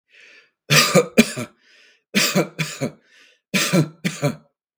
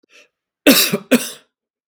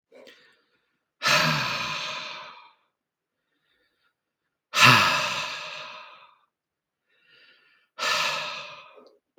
{
  "three_cough_length": "4.8 s",
  "three_cough_amplitude": 32768,
  "three_cough_signal_mean_std_ratio": 0.44,
  "cough_length": "1.9 s",
  "cough_amplitude": 32768,
  "cough_signal_mean_std_ratio": 0.36,
  "exhalation_length": "9.4 s",
  "exhalation_amplitude": 28777,
  "exhalation_signal_mean_std_ratio": 0.37,
  "survey_phase": "beta (2021-08-13 to 2022-03-07)",
  "age": "45-64",
  "gender": "Male",
  "wearing_mask": "No",
  "symptom_none": true,
  "smoker_status": "Never smoked",
  "respiratory_condition_asthma": false,
  "respiratory_condition_other": false,
  "recruitment_source": "REACT",
  "submission_delay": "1 day",
  "covid_test_result": "Negative",
  "covid_test_method": "RT-qPCR",
  "influenza_a_test_result": "Negative",
  "influenza_b_test_result": "Negative"
}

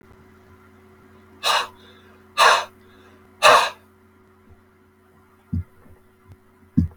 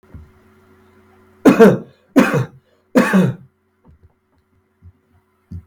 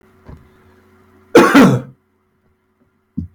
{
  "exhalation_length": "7.0 s",
  "exhalation_amplitude": 32768,
  "exhalation_signal_mean_std_ratio": 0.3,
  "three_cough_length": "5.7 s",
  "three_cough_amplitude": 32768,
  "three_cough_signal_mean_std_ratio": 0.33,
  "cough_length": "3.3 s",
  "cough_amplitude": 32768,
  "cough_signal_mean_std_ratio": 0.32,
  "survey_phase": "beta (2021-08-13 to 2022-03-07)",
  "age": "65+",
  "gender": "Male",
  "wearing_mask": "No",
  "symptom_none": true,
  "smoker_status": "Never smoked",
  "respiratory_condition_asthma": false,
  "respiratory_condition_other": false,
  "recruitment_source": "REACT",
  "submission_delay": "2 days",
  "covid_test_result": "Negative",
  "covid_test_method": "RT-qPCR",
  "influenza_a_test_result": "Negative",
  "influenza_b_test_result": "Negative"
}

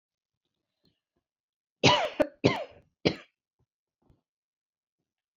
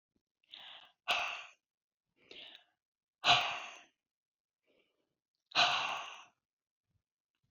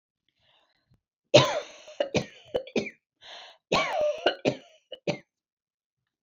{
  "three_cough_length": "5.4 s",
  "three_cough_amplitude": 17179,
  "three_cough_signal_mean_std_ratio": 0.23,
  "exhalation_length": "7.5 s",
  "exhalation_amplitude": 6901,
  "exhalation_signal_mean_std_ratio": 0.3,
  "cough_length": "6.2 s",
  "cough_amplitude": 22869,
  "cough_signal_mean_std_ratio": 0.34,
  "survey_phase": "beta (2021-08-13 to 2022-03-07)",
  "age": "65+",
  "gender": "Female",
  "wearing_mask": "No",
  "symptom_cough_any": true,
  "symptom_shortness_of_breath": true,
  "smoker_status": "Never smoked",
  "respiratory_condition_asthma": false,
  "respiratory_condition_other": false,
  "recruitment_source": "REACT",
  "submission_delay": "2 days",
  "covid_test_result": "Negative",
  "covid_test_method": "RT-qPCR"
}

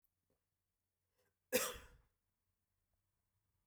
{
  "cough_length": "3.7 s",
  "cough_amplitude": 2754,
  "cough_signal_mean_std_ratio": 0.19,
  "survey_phase": "beta (2021-08-13 to 2022-03-07)",
  "age": "18-44",
  "gender": "Male",
  "wearing_mask": "No",
  "symptom_none": true,
  "smoker_status": "Ex-smoker",
  "respiratory_condition_asthma": false,
  "respiratory_condition_other": false,
  "recruitment_source": "REACT",
  "submission_delay": "0 days",
  "covid_test_result": "Negative",
  "covid_test_method": "RT-qPCR"
}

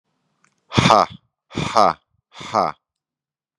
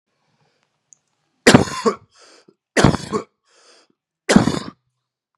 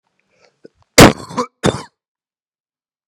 {
  "exhalation_length": "3.6 s",
  "exhalation_amplitude": 32768,
  "exhalation_signal_mean_std_ratio": 0.32,
  "three_cough_length": "5.4 s",
  "three_cough_amplitude": 32768,
  "three_cough_signal_mean_std_ratio": 0.28,
  "cough_length": "3.1 s",
  "cough_amplitude": 32768,
  "cough_signal_mean_std_ratio": 0.24,
  "survey_phase": "beta (2021-08-13 to 2022-03-07)",
  "age": "18-44",
  "gender": "Male",
  "wearing_mask": "No",
  "symptom_runny_or_blocked_nose": true,
  "symptom_sore_throat": true,
  "symptom_fatigue": true,
  "smoker_status": "Never smoked",
  "respiratory_condition_asthma": false,
  "respiratory_condition_other": false,
  "recruitment_source": "Test and Trace",
  "submission_delay": "0 days",
  "covid_test_result": "Positive",
  "covid_test_method": "LFT"
}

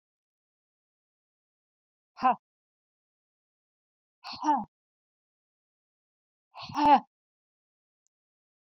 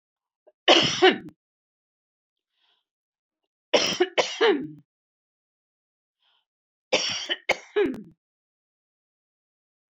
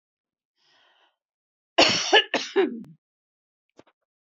{
  "exhalation_length": "8.8 s",
  "exhalation_amplitude": 12417,
  "exhalation_signal_mean_std_ratio": 0.2,
  "three_cough_length": "9.9 s",
  "three_cough_amplitude": 21269,
  "three_cough_signal_mean_std_ratio": 0.31,
  "cough_length": "4.4 s",
  "cough_amplitude": 23135,
  "cough_signal_mean_std_ratio": 0.3,
  "survey_phase": "alpha (2021-03-01 to 2021-08-12)",
  "age": "65+",
  "gender": "Female",
  "wearing_mask": "No",
  "symptom_none": true,
  "smoker_status": "Never smoked",
  "respiratory_condition_asthma": true,
  "respiratory_condition_other": false,
  "recruitment_source": "REACT",
  "submission_delay": "1 day",
  "covid_test_result": "Negative",
  "covid_test_method": "RT-qPCR"
}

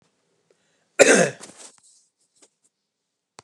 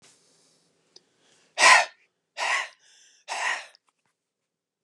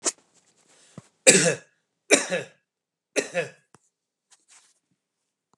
{
  "cough_length": "3.4 s",
  "cough_amplitude": 32229,
  "cough_signal_mean_std_ratio": 0.23,
  "exhalation_length": "4.8 s",
  "exhalation_amplitude": 24634,
  "exhalation_signal_mean_std_ratio": 0.27,
  "three_cough_length": "5.6 s",
  "three_cough_amplitude": 32768,
  "three_cough_signal_mean_std_ratio": 0.26,
  "survey_phase": "beta (2021-08-13 to 2022-03-07)",
  "age": "18-44",
  "gender": "Male",
  "wearing_mask": "No",
  "symptom_none": true,
  "smoker_status": "Never smoked",
  "respiratory_condition_asthma": false,
  "respiratory_condition_other": false,
  "recruitment_source": "REACT",
  "submission_delay": "1 day",
  "covid_test_result": "Negative",
  "covid_test_method": "RT-qPCR"
}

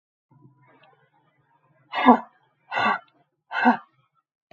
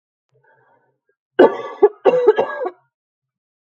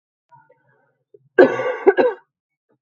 {
  "exhalation_length": "4.5 s",
  "exhalation_amplitude": 32766,
  "exhalation_signal_mean_std_ratio": 0.28,
  "three_cough_length": "3.7 s",
  "three_cough_amplitude": 32767,
  "three_cough_signal_mean_std_ratio": 0.34,
  "cough_length": "2.8 s",
  "cough_amplitude": 32768,
  "cough_signal_mean_std_ratio": 0.32,
  "survey_phase": "beta (2021-08-13 to 2022-03-07)",
  "age": "18-44",
  "gender": "Female",
  "wearing_mask": "No",
  "symptom_cough_any": true,
  "symptom_runny_or_blocked_nose": true,
  "symptom_fatigue": true,
  "symptom_onset": "2 days",
  "smoker_status": "Never smoked",
  "respiratory_condition_asthma": false,
  "respiratory_condition_other": false,
  "recruitment_source": "Test and Trace",
  "submission_delay": "1 day",
  "covid_test_result": "Positive",
  "covid_test_method": "RT-qPCR",
  "covid_ct_value": 22.0,
  "covid_ct_gene": "N gene"
}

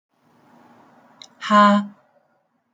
{
  "exhalation_length": "2.7 s",
  "exhalation_amplitude": 24857,
  "exhalation_signal_mean_std_ratio": 0.32,
  "survey_phase": "alpha (2021-03-01 to 2021-08-12)",
  "age": "18-44",
  "gender": "Male",
  "wearing_mask": "Yes",
  "symptom_none": true,
  "smoker_status": "Current smoker (e-cigarettes or vapes only)",
  "respiratory_condition_asthma": false,
  "respiratory_condition_other": false,
  "recruitment_source": "REACT",
  "submission_delay": "1 day",
  "covid_test_result": "Negative",
  "covid_test_method": "RT-qPCR"
}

